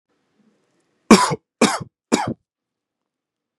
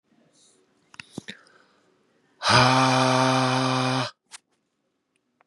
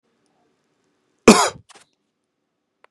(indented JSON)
{
  "three_cough_length": "3.6 s",
  "three_cough_amplitude": 32768,
  "three_cough_signal_mean_std_ratio": 0.26,
  "exhalation_length": "5.5 s",
  "exhalation_amplitude": 22884,
  "exhalation_signal_mean_std_ratio": 0.45,
  "cough_length": "2.9 s",
  "cough_amplitude": 32768,
  "cough_signal_mean_std_ratio": 0.19,
  "survey_phase": "beta (2021-08-13 to 2022-03-07)",
  "age": "18-44",
  "gender": "Male",
  "wearing_mask": "No",
  "symptom_none": true,
  "smoker_status": "Ex-smoker",
  "respiratory_condition_asthma": false,
  "respiratory_condition_other": false,
  "recruitment_source": "REACT",
  "submission_delay": "1 day",
  "covid_test_result": "Negative",
  "covid_test_method": "RT-qPCR",
  "influenza_a_test_result": "Negative",
  "influenza_b_test_result": "Negative"
}